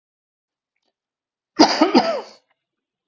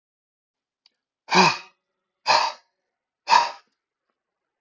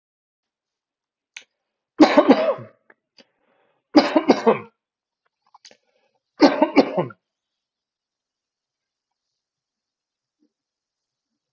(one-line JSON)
{"cough_length": "3.1 s", "cough_amplitude": 32768, "cough_signal_mean_std_ratio": 0.3, "exhalation_length": "4.6 s", "exhalation_amplitude": 23192, "exhalation_signal_mean_std_ratio": 0.3, "three_cough_length": "11.5 s", "three_cough_amplitude": 32768, "three_cough_signal_mean_std_ratio": 0.25, "survey_phase": "beta (2021-08-13 to 2022-03-07)", "age": "45-64", "gender": "Male", "wearing_mask": "No", "symptom_none": true, "smoker_status": "Never smoked", "respiratory_condition_asthma": false, "respiratory_condition_other": false, "recruitment_source": "REACT", "submission_delay": "2 days", "covid_test_result": "Negative", "covid_test_method": "RT-qPCR"}